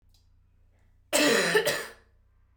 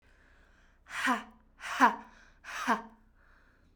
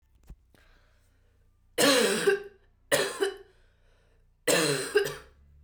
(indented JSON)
{
  "cough_length": "2.6 s",
  "cough_amplitude": 11754,
  "cough_signal_mean_std_ratio": 0.45,
  "exhalation_length": "3.8 s",
  "exhalation_amplitude": 11321,
  "exhalation_signal_mean_std_ratio": 0.35,
  "three_cough_length": "5.6 s",
  "three_cough_amplitude": 11656,
  "three_cough_signal_mean_std_ratio": 0.44,
  "survey_phase": "beta (2021-08-13 to 2022-03-07)",
  "age": "18-44",
  "gender": "Female",
  "wearing_mask": "Yes",
  "symptom_runny_or_blocked_nose": true,
  "symptom_fatigue": true,
  "symptom_fever_high_temperature": true,
  "symptom_headache": true,
  "symptom_change_to_sense_of_smell_or_taste": true,
  "symptom_onset": "2 days",
  "smoker_status": "Never smoked",
  "respiratory_condition_asthma": false,
  "respiratory_condition_other": false,
  "recruitment_source": "Test and Trace",
  "submission_delay": "2 days",
  "covid_test_result": "Positive",
  "covid_test_method": "RT-qPCR",
  "covid_ct_value": 27.2,
  "covid_ct_gene": "ORF1ab gene",
  "covid_ct_mean": 28.0,
  "covid_viral_load": "640 copies/ml",
  "covid_viral_load_category": "Minimal viral load (< 10K copies/ml)"
}